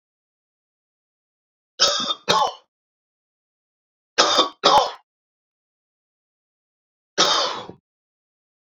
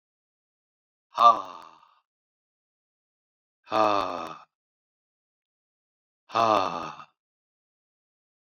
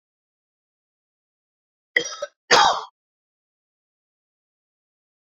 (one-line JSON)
{"three_cough_length": "8.7 s", "three_cough_amplitude": 32768, "three_cough_signal_mean_std_ratio": 0.32, "exhalation_length": "8.4 s", "exhalation_amplitude": 19243, "exhalation_signal_mean_std_ratio": 0.25, "cough_length": "5.4 s", "cough_amplitude": 26151, "cough_signal_mean_std_ratio": 0.21, "survey_phase": "beta (2021-08-13 to 2022-03-07)", "age": "45-64", "gender": "Male", "wearing_mask": "No", "symptom_none": true, "smoker_status": "Never smoked", "respiratory_condition_asthma": true, "respiratory_condition_other": false, "recruitment_source": "REACT", "submission_delay": "4 days", "covid_test_result": "Negative", "covid_test_method": "RT-qPCR"}